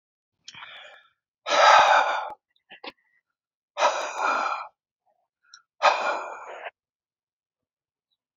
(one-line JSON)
{"exhalation_length": "8.4 s", "exhalation_amplitude": 21043, "exhalation_signal_mean_std_ratio": 0.37, "survey_phase": "alpha (2021-03-01 to 2021-08-12)", "age": "65+", "gender": "Male", "wearing_mask": "No", "symptom_none": true, "smoker_status": "Ex-smoker", "respiratory_condition_asthma": false, "respiratory_condition_other": false, "recruitment_source": "REACT", "submission_delay": "2 days", "covid_test_result": "Negative", "covid_test_method": "RT-qPCR"}